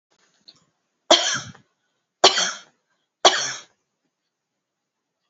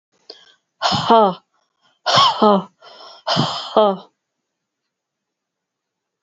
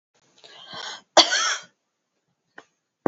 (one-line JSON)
{"three_cough_length": "5.3 s", "three_cough_amplitude": 31361, "three_cough_signal_mean_std_ratio": 0.27, "exhalation_length": "6.2 s", "exhalation_amplitude": 27866, "exhalation_signal_mean_std_ratio": 0.38, "cough_length": "3.1 s", "cough_amplitude": 30450, "cough_signal_mean_std_ratio": 0.27, "survey_phase": "beta (2021-08-13 to 2022-03-07)", "age": "45-64", "gender": "Female", "wearing_mask": "No", "symptom_cough_any": true, "symptom_runny_or_blocked_nose": true, "symptom_onset": "5 days", "smoker_status": "Ex-smoker", "respiratory_condition_asthma": false, "respiratory_condition_other": false, "recruitment_source": "Test and Trace", "submission_delay": "2 days", "covid_test_result": "Positive", "covid_test_method": "RT-qPCR", "covid_ct_value": 24.1, "covid_ct_gene": "ORF1ab gene", "covid_ct_mean": 24.2, "covid_viral_load": "11000 copies/ml", "covid_viral_load_category": "Low viral load (10K-1M copies/ml)"}